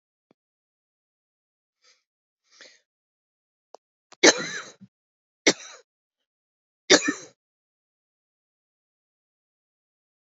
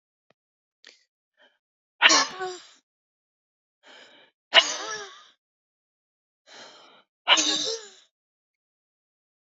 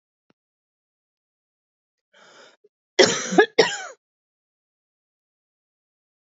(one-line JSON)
{"three_cough_length": "10.2 s", "three_cough_amplitude": 29228, "three_cough_signal_mean_std_ratio": 0.15, "exhalation_length": "9.5 s", "exhalation_amplitude": 26467, "exhalation_signal_mean_std_ratio": 0.25, "cough_length": "6.3 s", "cough_amplitude": 30424, "cough_signal_mean_std_ratio": 0.2, "survey_phase": "beta (2021-08-13 to 2022-03-07)", "age": "45-64", "gender": "Female", "wearing_mask": "No", "symptom_cough_any": true, "symptom_runny_or_blocked_nose": true, "symptom_sore_throat": true, "symptom_fatigue": true, "symptom_fever_high_temperature": true, "symptom_headache": true, "symptom_onset": "5 days", "smoker_status": "Never smoked", "respiratory_condition_asthma": true, "respiratory_condition_other": false, "recruitment_source": "Test and Trace", "submission_delay": "2 days", "covid_test_result": "Positive", "covid_test_method": "RT-qPCR", "covid_ct_value": 28.4, "covid_ct_gene": "ORF1ab gene", "covid_ct_mean": 29.0, "covid_viral_load": "320 copies/ml", "covid_viral_load_category": "Minimal viral load (< 10K copies/ml)"}